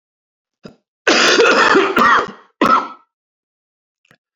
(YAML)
cough_length: 4.4 s
cough_amplitude: 32767
cough_signal_mean_std_ratio: 0.5
survey_phase: beta (2021-08-13 to 2022-03-07)
age: 65+
gender: Male
wearing_mask: 'No'
symptom_cough_any: true
symptom_runny_or_blocked_nose: true
symptom_diarrhoea: true
symptom_fatigue: true
symptom_fever_high_temperature: true
symptom_other: true
symptom_onset: 5 days
smoker_status: Never smoked
respiratory_condition_asthma: false
respiratory_condition_other: false
recruitment_source: Test and Trace
submission_delay: 2 days
covid_test_result: Positive
covid_test_method: RT-qPCR
covid_ct_value: 14.8
covid_ct_gene: ORF1ab gene
covid_ct_mean: 15.1
covid_viral_load: 11000000 copies/ml
covid_viral_load_category: High viral load (>1M copies/ml)